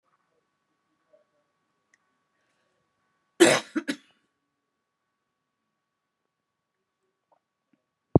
{"cough_length": "8.2 s", "cough_amplitude": 24332, "cough_signal_mean_std_ratio": 0.14, "survey_phase": "beta (2021-08-13 to 2022-03-07)", "age": "65+", "gender": "Female", "wearing_mask": "No", "symptom_none": true, "smoker_status": "Current smoker (1 to 10 cigarettes per day)", "respiratory_condition_asthma": false, "respiratory_condition_other": false, "recruitment_source": "REACT", "submission_delay": "1 day", "covid_test_result": "Negative", "covid_test_method": "RT-qPCR"}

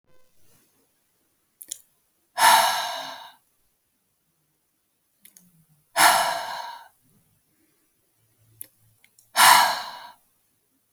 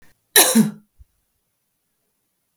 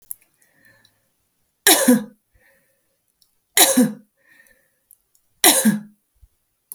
{"exhalation_length": "10.9 s", "exhalation_amplitude": 27768, "exhalation_signal_mean_std_ratio": 0.29, "cough_length": "2.6 s", "cough_amplitude": 32768, "cough_signal_mean_std_ratio": 0.28, "three_cough_length": "6.7 s", "three_cough_amplitude": 32768, "three_cough_signal_mean_std_ratio": 0.3, "survey_phase": "beta (2021-08-13 to 2022-03-07)", "age": "18-44", "gender": "Female", "wearing_mask": "No", "symptom_runny_or_blocked_nose": true, "symptom_fatigue": true, "symptom_change_to_sense_of_smell_or_taste": true, "symptom_other": true, "smoker_status": "Never smoked", "respiratory_condition_asthma": false, "respiratory_condition_other": false, "recruitment_source": "Test and Trace", "submission_delay": "2 days", "covid_test_result": "Positive", "covid_test_method": "RT-qPCR", "covid_ct_value": 16.3, "covid_ct_gene": "ORF1ab gene", "covid_ct_mean": 16.8, "covid_viral_load": "3000000 copies/ml", "covid_viral_load_category": "High viral load (>1M copies/ml)"}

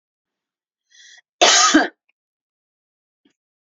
{"cough_length": "3.7 s", "cough_amplitude": 29494, "cough_signal_mean_std_ratio": 0.28, "survey_phase": "beta (2021-08-13 to 2022-03-07)", "age": "45-64", "gender": "Female", "wearing_mask": "No", "symptom_cough_any": true, "symptom_headache": true, "symptom_onset": "12 days", "smoker_status": "Ex-smoker", "respiratory_condition_asthma": false, "respiratory_condition_other": false, "recruitment_source": "REACT", "submission_delay": "1 day", "covid_test_result": "Negative", "covid_test_method": "RT-qPCR", "influenza_a_test_result": "Negative", "influenza_b_test_result": "Negative"}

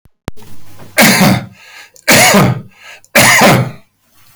{"three_cough_length": "4.4 s", "three_cough_amplitude": 32768, "three_cough_signal_mean_std_ratio": 0.61, "survey_phase": "beta (2021-08-13 to 2022-03-07)", "age": "65+", "gender": "Male", "wearing_mask": "No", "symptom_none": true, "smoker_status": "Ex-smoker", "respiratory_condition_asthma": false, "respiratory_condition_other": true, "recruitment_source": "REACT", "submission_delay": "8 days", "covid_test_result": "Negative", "covid_test_method": "RT-qPCR", "covid_ct_value": 42.0, "covid_ct_gene": "N gene"}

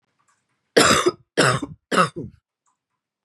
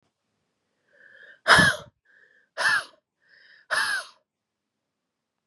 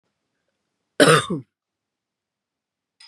{"three_cough_length": "3.2 s", "three_cough_amplitude": 27397, "three_cough_signal_mean_std_ratio": 0.39, "exhalation_length": "5.5 s", "exhalation_amplitude": 22619, "exhalation_signal_mean_std_ratio": 0.29, "cough_length": "3.1 s", "cough_amplitude": 31058, "cough_signal_mean_std_ratio": 0.24, "survey_phase": "beta (2021-08-13 to 2022-03-07)", "age": "18-44", "gender": "Female", "wearing_mask": "No", "symptom_cough_any": true, "symptom_new_continuous_cough": true, "symptom_runny_or_blocked_nose": true, "symptom_sore_throat": true, "symptom_headache": true, "symptom_other": true, "symptom_onset": "3 days", "smoker_status": "Ex-smoker", "respiratory_condition_asthma": false, "respiratory_condition_other": false, "recruitment_source": "Test and Trace", "submission_delay": "1 day", "covid_test_result": "Positive", "covid_test_method": "RT-qPCR", "covid_ct_value": 26.4, "covid_ct_gene": "N gene"}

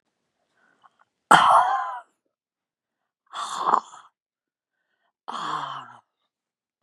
{"exhalation_length": "6.8 s", "exhalation_amplitude": 32093, "exhalation_signal_mean_std_ratio": 0.3, "survey_phase": "beta (2021-08-13 to 2022-03-07)", "age": "45-64", "gender": "Female", "wearing_mask": "No", "symptom_cough_any": true, "symptom_loss_of_taste": true, "smoker_status": "Never smoked", "respiratory_condition_asthma": false, "respiratory_condition_other": false, "recruitment_source": "REACT", "submission_delay": "1 day", "covid_test_result": "Negative", "covid_test_method": "RT-qPCR", "influenza_a_test_result": "Negative", "influenza_b_test_result": "Negative"}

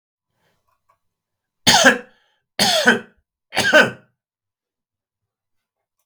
{"three_cough_length": "6.1 s", "three_cough_amplitude": 32768, "three_cough_signal_mean_std_ratio": 0.31, "survey_phase": "beta (2021-08-13 to 2022-03-07)", "age": "45-64", "gender": "Male", "wearing_mask": "No", "symptom_none": true, "smoker_status": "Never smoked", "respiratory_condition_asthma": false, "respiratory_condition_other": false, "recruitment_source": "REACT", "submission_delay": "3 days", "covid_test_result": "Negative", "covid_test_method": "RT-qPCR", "influenza_a_test_result": "Negative", "influenza_b_test_result": "Negative"}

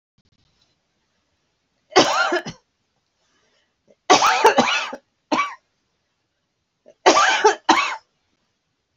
{"three_cough_length": "9.0 s", "three_cough_amplitude": 29755, "three_cough_signal_mean_std_ratio": 0.37, "survey_phase": "beta (2021-08-13 to 2022-03-07)", "age": "65+", "gender": "Female", "wearing_mask": "No", "symptom_runny_or_blocked_nose": true, "symptom_diarrhoea": true, "symptom_headache": true, "symptom_onset": "12 days", "smoker_status": "Ex-smoker", "respiratory_condition_asthma": true, "respiratory_condition_other": false, "recruitment_source": "REACT", "submission_delay": "1 day", "covid_test_result": "Negative", "covid_test_method": "RT-qPCR", "influenza_a_test_result": "Negative", "influenza_b_test_result": "Negative"}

